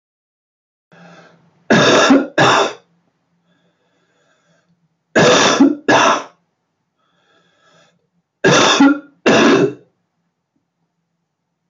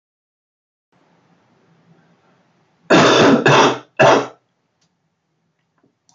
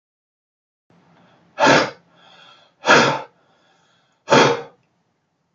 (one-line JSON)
{"three_cough_length": "11.7 s", "three_cough_amplitude": 30054, "three_cough_signal_mean_std_ratio": 0.42, "cough_length": "6.1 s", "cough_amplitude": 29781, "cough_signal_mean_std_ratio": 0.35, "exhalation_length": "5.5 s", "exhalation_amplitude": 32767, "exhalation_signal_mean_std_ratio": 0.33, "survey_phase": "beta (2021-08-13 to 2022-03-07)", "age": "45-64", "gender": "Male", "wearing_mask": "No", "symptom_cough_any": true, "symptom_runny_or_blocked_nose": true, "symptom_fatigue": true, "symptom_headache": true, "smoker_status": "Ex-smoker", "respiratory_condition_asthma": false, "respiratory_condition_other": false, "recruitment_source": "Test and Trace", "submission_delay": "3 days", "covid_test_result": "Positive", "covid_test_method": "RT-qPCR"}